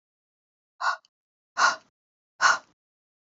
{
  "exhalation_length": "3.2 s",
  "exhalation_amplitude": 15398,
  "exhalation_signal_mean_std_ratio": 0.29,
  "survey_phase": "beta (2021-08-13 to 2022-03-07)",
  "age": "18-44",
  "gender": "Female",
  "wearing_mask": "No",
  "symptom_cough_any": true,
  "symptom_onset": "6 days",
  "smoker_status": "Never smoked",
  "respiratory_condition_asthma": false,
  "respiratory_condition_other": false,
  "recruitment_source": "REACT",
  "submission_delay": "1 day",
  "covid_test_result": "Negative",
  "covid_test_method": "RT-qPCR",
  "influenza_a_test_result": "Negative",
  "influenza_b_test_result": "Negative"
}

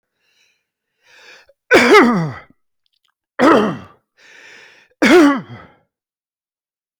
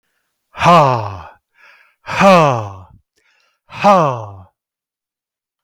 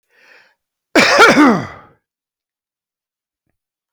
{
  "three_cough_length": "7.0 s",
  "three_cough_amplitude": 31741,
  "three_cough_signal_mean_std_ratio": 0.37,
  "exhalation_length": "5.6 s",
  "exhalation_amplitude": 32768,
  "exhalation_signal_mean_std_ratio": 0.42,
  "cough_length": "3.9 s",
  "cough_amplitude": 32767,
  "cough_signal_mean_std_ratio": 0.35,
  "survey_phase": "beta (2021-08-13 to 2022-03-07)",
  "age": "65+",
  "gender": "Male",
  "wearing_mask": "No",
  "symptom_none": true,
  "smoker_status": "Never smoked",
  "respiratory_condition_asthma": false,
  "respiratory_condition_other": false,
  "recruitment_source": "REACT",
  "submission_delay": "1 day",
  "covid_test_result": "Negative",
  "covid_test_method": "RT-qPCR"
}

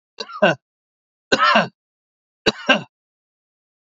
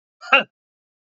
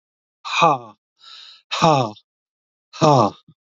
{
  "three_cough_length": "3.8 s",
  "three_cough_amplitude": 28643,
  "three_cough_signal_mean_std_ratio": 0.33,
  "cough_length": "1.2 s",
  "cough_amplitude": 28657,
  "cough_signal_mean_std_ratio": 0.23,
  "exhalation_length": "3.8 s",
  "exhalation_amplitude": 32730,
  "exhalation_signal_mean_std_ratio": 0.38,
  "survey_phase": "beta (2021-08-13 to 2022-03-07)",
  "age": "65+",
  "gender": "Male",
  "wearing_mask": "No",
  "symptom_cough_any": true,
  "symptom_runny_or_blocked_nose": true,
  "symptom_fatigue": true,
  "symptom_headache": true,
  "symptom_change_to_sense_of_smell_or_taste": true,
  "symptom_onset": "11 days",
  "smoker_status": "Ex-smoker",
  "respiratory_condition_asthma": false,
  "respiratory_condition_other": false,
  "recruitment_source": "REACT",
  "submission_delay": "1 day",
  "covid_test_result": "Negative",
  "covid_test_method": "RT-qPCR",
  "influenza_a_test_result": "Negative",
  "influenza_b_test_result": "Negative"
}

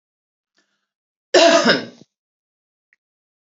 {
  "cough_length": "3.5 s",
  "cough_amplitude": 30821,
  "cough_signal_mean_std_ratio": 0.29,
  "survey_phase": "beta (2021-08-13 to 2022-03-07)",
  "age": "45-64",
  "gender": "Female",
  "wearing_mask": "No",
  "symptom_cough_any": true,
  "symptom_runny_or_blocked_nose": true,
  "symptom_onset": "3 days",
  "smoker_status": "Never smoked",
  "respiratory_condition_asthma": false,
  "respiratory_condition_other": false,
  "recruitment_source": "Test and Trace",
  "submission_delay": "1 day",
  "covid_test_result": "Negative",
  "covid_test_method": "RT-qPCR"
}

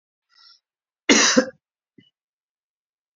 {
  "cough_length": "3.2 s",
  "cough_amplitude": 27863,
  "cough_signal_mean_std_ratio": 0.26,
  "survey_phase": "beta (2021-08-13 to 2022-03-07)",
  "age": "45-64",
  "gender": "Male",
  "wearing_mask": "No",
  "symptom_none": true,
  "smoker_status": "Never smoked",
  "respiratory_condition_asthma": false,
  "respiratory_condition_other": false,
  "recruitment_source": "REACT",
  "submission_delay": "1 day",
  "covid_test_result": "Negative",
  "covid_test_method": "RT-qPCR",
  "influenza_a_test_result": "Negative",
  "influenza_b_test_result": "Negative"
}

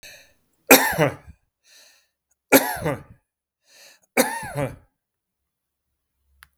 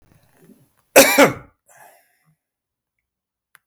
{
  "three_cough_length": "6.6 s",
  "three_cough_amplitude": 32768,
  "three_cough_signal_mean_std_ratio": 0.28,
  "cough_length": "3.7 s",
  "cough_amplitude": 32768,
  "cough_signal_mean_std_ratio": 0.24,
  "survey_phase": "beta (2021-08-13 to 2022-03-07)",
  "age": "65+",
  "gender": "Male",
  "wearing_mask": "No",
  "symptom_none": true,
  "smoker_status": "Never smoked",
  "respiratory_condition_asthma": false,
  "respiratory_condition_other": false,
  "recruitment_source": "REACT",
  "submission_delay": "3 days",
  "covid_test_result": "Negative",
  "covid_test_method": "RT-qPCR",
  "influenza_a_test_result": "Negative",
  "influenza_b_test_result": "Negative"
}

